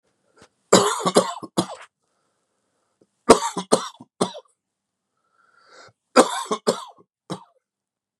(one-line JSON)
{"three_cough_length": "8.2 s", "three_cough_amplitude": 32768, "three_cough_signal_mean_std_ratio": 0.28, "survey_phase": "beta (2021-08-13 to 2022-03-07)", "age": "45-64", "gender": "Male", "wearing_mask": "No", "symptom_cough_any": true, "symptom_sore_throat": true, "symptom_fatigue": true, "symptom_onset": "3 days", "smoker_status": "Never smoked", "respiratory_condition_asthma": false, "respiratory_condition_other": false, "recruitment_source": "REACT", "submission_delay": "1 day", "covid_test_result": "Positive", "covid_test_method": "RT-qPCR", "covid_ct_value": 24.9, "covid_ct_gene": "E gene", "influenza_a_test_result": "Negative", "influenza_b_test_result": "Negative"}